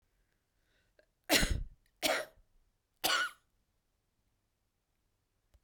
{"three_cough_length": "5.6 s", "three_cough_amplitude": 7437, "three_cough_signal_mean_std_ratio": 0.3, "survey_phase": "beta (2021-08-13 to 2022-03-07)", "age": "65+", "gender": "Female", "wearing_mask": "No", "symptom_none": true, "smoker_status": "Never smoked", "respiratory_condition_asthma": false, "respiratory_condition_other": false, "recruitment_source": "REACT", "submission_delay": "1 day", "covid_test_result": "Negative", "covid_test_method": "RT-qPCR", "influenza_a_test_result": "Negative", "influenza_b_test_result": "Negative"}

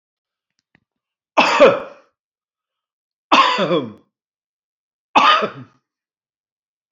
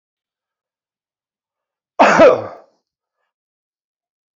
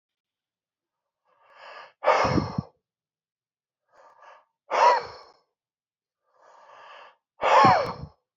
{"three_cough_length": "6.9 s", "three_cough_amplitude": 28967, "three_cough_signal_mean_std_ratio": 0.33, "cough_length": "4.4 s", "cough_amplitude": 29637, "cough_signal_mean_std_ratio": 0.25, "exhalation_length": "8.4 s", "exhalation_amplitude": 19864, "exhalation_signal_mean_std_ratio": 0.32, "survey_phase": "beta (2021-08-13 to 2022-03-07)", "age": "65+", "gender": "Male", "wearing_mask": "No", "symptom_none": true, "smoker_status": "Never smoked", "respiratory_condition_asthma": false, "respiratory_condition_other": false, "recruitment_source": "REACT", "submission_delay": "1 day", "covid_test_result": "Negative", "covid_test_method": "RT-qPCR", "influenza_a_test_result": "Negative", "influenza_b_test_result": "Negative"}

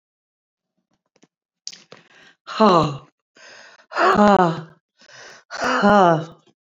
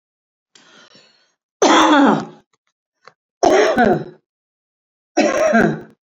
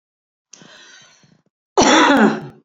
{"exhalation_length": "6.7 s", "exhalation_amplitude": 29503, "exhalation_signal_mean_std_ratio": 0.37, "three_cough_length": "6.1 s", "three_cough_amplitude": 29424, "three_cough_signal_mean_std_ratio": 0.46, "cough_length": "2.6 s", "cough_amplitude": 29492, "cough_signal_mean_std_ratio": 0.42, "survey_phase": "beta (2021-08-13 to 2022-03-07)", "age": "45-64", "gender": "Female", "wearing_mask": "No", "symptom_none": true, "smoker_status": "Current smoker (1 to 10 cigarettes per day)", "respiratory_condition_asthma": false, "respiratory_condition_other": true, "recruitment_source": "REACT", "submission_delay": "2 days", "covid_test_result": "Negative", "covid_test_method": "RT-qPCR", "influenza_a_test_result": "Negative", "influenza_b_test_result": "Negative"}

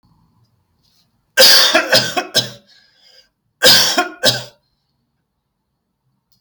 {"cough_length": "6.4 s", "cough_amplitude": 32768, "cough_signal_mean_std_ratio": 0.38, "survey_phase": "alpha (2021-03-01 to 2021-08-12)", "age": "45-64", "gender": "Male", "wearing_mask": "No", "symptom_none": true, "smoker_status": "Ex-smoker", "respiratory_condition_asthma": false, "respiratory_condition_other": false, "recruitment_source": "REACT", "submission_delay": "2 days", "covid_test_result": "Negative", "covid_test_method": "RT-qPCR"}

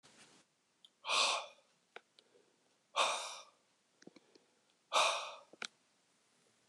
{"exhalation_length": "6.7 s", "exhalation_amplitude": 4443, "exhalation_signal_mean_std_ratio": 0.33, "survey_phase": "beta (2021-08-13 to 2022-03-07)", "age": "45-64", "gender": "Male", "wearing_mask": "No", "symptom_cough_any": true, "symptom_runny_or_blocked_nose": true, "symptom_shortness_of_breath": true, "symptom_diarrhoea": true, "symptom_fatigue": true, "symptom_headache": true, "symptom_change_to_sense_of_smell_or_taste": true, "symptom_loss_of_taste": true, "symptom_other": true, "symptom_onset": "5 days", "smoker_status": "Ex-smoker", "respiratory_condition_asthma": false, "respiratory_condition_other": false, "recruitment_source": "Test and Trace", "submission_delay": "1 day", "covid_test_result": "Positive", "covid_test_method": "RT-qPCR"}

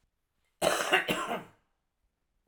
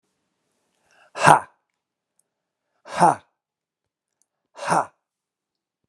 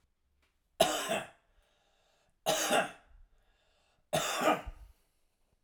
{"cough_length": "2.5 s", "cough_amplitude": 9157, "cough_signal_mean_std_ratio": 0.41, "exhalation_length": "5.9 s", "exhalation_amplitude": 32768, "exhalation_signal_mean_std_ratio": 0.22, "three_cough_length": "5.6 s", "three_cough_amplitude": 8184, "three_cough_signal_mean_std_ratio": 0.39, "survey_phase": "alpha (2021-03-01 to 2021-08-12)", "age": "45-64", "gender": "Male", "wearing_mask": "No", "symptom_none": true, "smoker_status": "Never smoked", "respiratory_condition_asthma": false, "respiratory_condition_other": false, "recruitment_source": "REACT", "submission_delay": "2 days", "covid_test_result": "Negative", "covid_test_method": "RT-qPCR"}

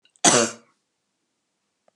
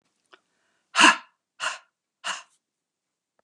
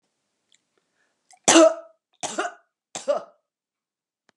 {"cough_length": "2.0 s", "cough_amplitude": 28084, "cough_signal_mean_std_ratio": 0.27, "exhalation_length": "3.4 s", "exhalation_amplitude": 25721, "exhalation_signal_mean_std_ratio": 0.23, "three_cough_length": "4.4 s", "three_cough_amplitude": 29462, "three_cough_signal_mean_std_ratio": 0.25, "survey_phase": "beta (2021-08-13 to 2022-03-07)", "age": "45-64", "gender": "Female", "wearing_mask": "No", "symptom_cough_any": true, "smoker_status": "Never smoked", "respiratory_condition_asthma": false, "respiratory_condition_other": false, "recruitment_source": "REACT", "submission_delay": "1 day", "covid_test_result": "Negative", "covid_test_method": "RT-qPCR"}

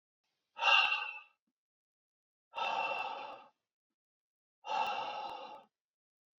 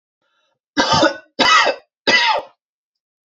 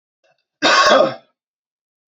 {"exhalation_length": "6.4 s", "exhalation_amplitude": 6264, "exhalation_signal_mean_std_ratio": 0.41, "three_cough_length": "3.2 s", "three_cough_amplitude": 31122, "three_cough_signal_mean_std_ratio": 0.49, "cough_length": "2.1 s", "cough_amplitude": 30859, "cough_signal_mean_std_ratio": 0.4, "survey_phase": "beta (2021-08-13 to 2022-03-07)", "age": "45-64", "gender": "Male", "wearing_mask": "No", "symptom_sore_throat": true, "symptom_onset": "13 days", "smoker_status": "Never smoked", "respiratory_condition_asthma": false, "respiratory_condition_other": false, "recruitment_source": "REACT", "submission_delay": "1 day", "covid_test_result": "Negative", "covid_test_method": "RT-qPCR", "influenza_a_test_result": "Negative", "influenza_b_test_result": "Negative"}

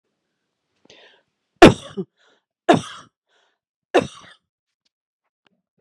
{"three_cough_length": "5.8 s", "three_cough_amplitude": 32768, "three_cough_signal_mean_std_ratio": 0.18, "survey_phase": "beta (2021-08-13 to 2022-03-07)", "age": "45-64", "gender": "Female", "wearing_mask": "No", "symptom_none": true, "smoker_status": "Ex-smoker", "respiratory_condition_asthma": false, "respiratory_condition_other": false, "recruitment_source": "REACT", "submission_delay": "1 day", "covid_test_result": "Negative", "covid_test_method": "RT-qPCR"}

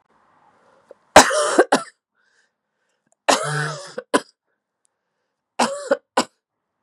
{"three_cough_length": "6.8 s", "three_cough_amplitude": 32768, "three_cough_signal_mean_std_ratio": 0.29, "survey_phase": "beta (2021-08-13 to 2022-03-07)", "age": "45-64", "gender": "Female", "wearing_mask": "Yes", "symptom_runny_or_blocked_nose": true, "symptom_change_to_sense_of_smell_or_taste": true, "symptom_onset": "3 days", "smoker_status": "Ex-smoker", "respiratory_condition_asthma": false, "respiratory_condition_other": false, "recruitment_source": "Test and Trace", "submission_delay": "1 day", "covid_test_result": "Positive", "covid_test_method": "RT-qPCR", "covid_ct_value": 17.5, "covid_ct_gene": "ORF1ab gene", "covid_ct_mean": 18.6, "covid_viral_load": "800000 copies/ml", "covid_viral_load_category": "Low viral load (10K-1M copies/ml)"}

